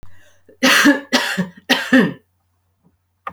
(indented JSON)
{
  "three_cough_length": "3.3 s",
  "three_cough_amplitude": 30791,
  "three_cough_signal_mean_std_ratio": 0.46,
  "survey_phase": "beta (2021-08-13 to 2022-03-07)",
  "age": "18-44",
  "gender": "Female",
  "wearing_mask": "No",
  "symptom_none": true,
  "smoker_status": "Ex-smoker",
  "respiratory_condition_asthma": false,
  "respiratory_condition_other": false,
  "recruitment_source": "REACT",
  "submission_delay": "3 days",
  "covid_test_result": "Negative",
  "covid_test_method": "RT-qPCR"
}